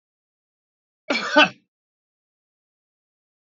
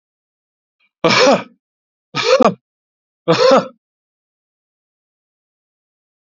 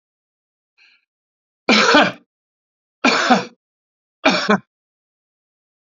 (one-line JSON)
{"cough_length": "3.5 s", "cough_amplitude": 24017, "cough_signal_mean_std_ratio": 0.21, "exhalation_length": "6.2 s", "exhalation_amplitude": 32767, "exhalation_signal_mean_std_ratio": 0.33, "three_cough_length": "5.9 s", "three_cough_amplitude": 32767, "three_cough_signal_mean_std_ratio": 0.34, "survey_phase": "beta (2021-08-13 to 2022-03-07)", "age": "65+", "gender": "Male", "wearing_mask": "No", "symptom_none": true, "smoker_status": "Ex-smoker", "respiratory_condition_asthma": false, "respiratory_condition_other": false, "recruitment_source": "REACT", "submission_delay": "1 day", "covid_test_result": "Negative", "covid_test_method": "RT-qPCR", "influenza_a_test_result": "Negative", "influenza_b_test_result": "Negative"}